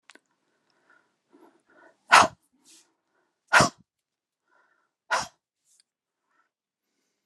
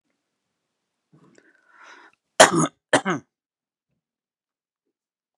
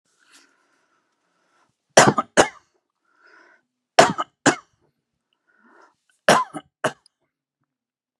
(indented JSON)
{
  "exhalation_length": "7.3 s",
  "exhalation_amplitude": 27416,
  "exhalation_signal_mean_std_ratio": 0.18,
  "cough_length": "5.4 s",
  "cough_amplitude": 32768,
  "cough_signal_mean_std_ratio": 0.19,
  "three_cough_length": "8.2 s",
  "three_cough_amplitude": 32768,
  "three_cough_signal_mean_std_ratio": 0.22,
  "survey_phase": "beta (2021-08-13 to 2022-03-07)",
  "age": "65+",
  "gender": "Male",
  "wearing_mask": "No",
  "symptom_none": true,
  "smoker_status": "Never smoked",
  "respiratory_condition_asthma": false,
  "respiratory_condition_other": false,
  "recruitment_source": "REACT",
  "submission_delay": "3 days",
  "covid_test_result": "Negative",
  "covid_test_method": "RT-qPCR"
}